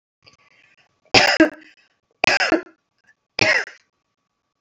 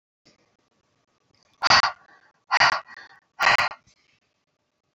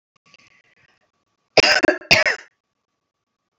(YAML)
three_cough_length: 4.6 s
three_cough_amplitude: 32030
three_cough_signal_mean_std_ratio: 0.33
exhalation_length: 4.9 s
exhalation_amplitude: 24049
exhalation_signal_mean_std_ratio: 0.3
cough_length: 3.6 s
cough_amplitude: 32379
cough_signal_mean_std_ratio: 0.29
survey_phase: beta (2021-08-13 to 2022-03-07)
age: 45-64
gender: Female
wearing_mask: 'No'
symptom_none: true
smoker_status: Never smoked
respiratory_condition_asthma: false
respiratory_condition_other: false
recruitment_source: REACT
submission_delay: 2 days
covid_test_result: Negative
covid_test_method: RT-qPCR
influenza_a_test_result: Negative
influenza_b_test_result: Negative